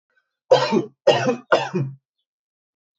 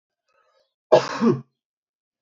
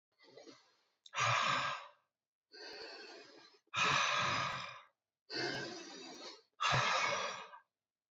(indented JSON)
{
  "three_cough_length": "3.0 s",
  "three_cough_amplitude": 27121,
  "three_cough_signal_mean_std_ratio": 0.42,
  "cough_length": "2.2 s",
  "cough_amplitude": 27313,
  "cough_signal_mean_std_ratio": 0.29,
  "exhalation_length": "8.1 s",
  "exhalation_amplitude": 3285,
  "exhalation_signal_mean_std_ratio": 0.55,
  "survey_phase": "alpha (2021-03-01 to 2021-08-12)",
  "age": "18-44",
  "gender": "Male",
  "wearing_mask": "No",
  "symptom_none": true,
  "smoker_status": "Current smoker (11 or more cigarettes per day)",
  "respiratory_condition_asthma": false,
  "respiratory_condition_other": false,
  "recruitment_source": "REACT",
  "submission_delay": "5 days",
  "covid_test_result": "Negative",
  "covid_test_method": "RT-qPCR"
}